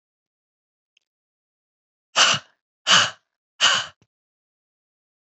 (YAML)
exhalation_length: 5.3 s
exhalation_amplitude: 27670
exhalation_signal_mean_std_ratio: 0.27
survey_phase: alpha (2021-03-01 to 2021-08-12)
age: 65+
gender: Female
wearing_mask: 'No'
symptom_cough_any: true
symptom_fatigue: true
symptom_headache: true
smoker_status: Ex-smoker
respiratory_condition_asthma: true
respiratory_condition_other: false
recruitment_source: Test and Trace
submission_delay: 2 days
covid_test_result: Positive
covid_test_method: RT-qPCR
covid_ct_value: 21.9
covid_ct_gene: ORF1ab gene
covid_ct_mean: 22.8
covid_viral_load: 32000 copies/ml
covid_viral_load_category: Low viral load (10K-1M copies/ml)